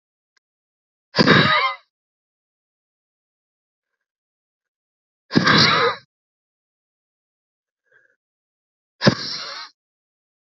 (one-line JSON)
{"exhalation_length": "10.6 s", "exhalation_amplitude": 27604, "exhalation_signal_mean_std_ratio": 0.28, "survey_phase": "beta (2021-08-13 to 2022-03-07)", "age": "18-44", "gender": "Female", "wearing_mask": "No", "symptom_cough_any": true, "symptom_new_continuous_cough": true, "symptom_runny_or_blocked_nose": true, "symptom_shortness_of_breath": true, "symptom_fatigue": true, "symptom_headache": true, "symptom_onset": "4 days", "smoker_status": "Never smoked", "respiratory_condition_asthma": true, "respiratory_condition_other": false, "recruitment_source": "REACT", "submission_delay": "1 day", "covid_test_result": "Positive", "covid_test_method": "RT-qPCR", "covid_ct_value": 18.0, "covid_ct_gene": "E gene", "influenza_a_test_result": "Negative", "influenza_b_test_result": "Negative"}